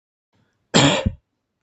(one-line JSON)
{"cough_length": "1.6 s", "cough_amplitude": 32766, "cough_signal_mean_std_ratio": 0.35, "survey_phase": "beta (2021-08-13 to 2022-03-07)", "age": "45-64", "gender": "Male", "wearing_mask": "No", "symptom_none": true, "smoker_status": "Never smoked", "respiratory_condition_asthma": false, "respiratory_condition_other": false, "recruitment_source": "REACT", "submission_delay": "2 days", "covid_test_result": "Negative", "covid_test_method": "RT-qPCR", "influenza_a_test_result": "Negative", "influenza_b_test_result": "Negative"}